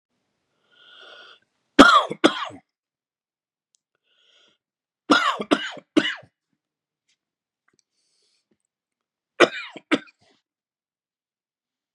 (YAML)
three_cough_length: 11.9 s
three_cough_amplitude: 32768
three_cough_signal_mean_std_ratio: 0.22
survey_phase: beta (2021-08-13 to 2022-03-07)
age: 45-64
gender: Male
wearing_mask: 'No'
symptom_cough_any: true
symptom_runny_or_blocked_nose: true
symptom_fatigue: true
symptom_change_to_sense_of_smell_or_taste: true
symptom_loss_of_taste: true
symptom_onset: 7 days
smoker_status: Never smoked
respiratory_condition_asthma: false
respiratory_condition_other: false
recruitment_source: Test and Trace
submission_delay: 2 days
covid_test_result: Positive
covid_test_method: RT-qPCR
covid_ct_value: 14.8
covid_ct_gene: N gene
covid_ct_mean: 15.0
covid_viral_load: 12000000 copies/ml
covid_viral_load_category: High viral load (>1M copies/ml)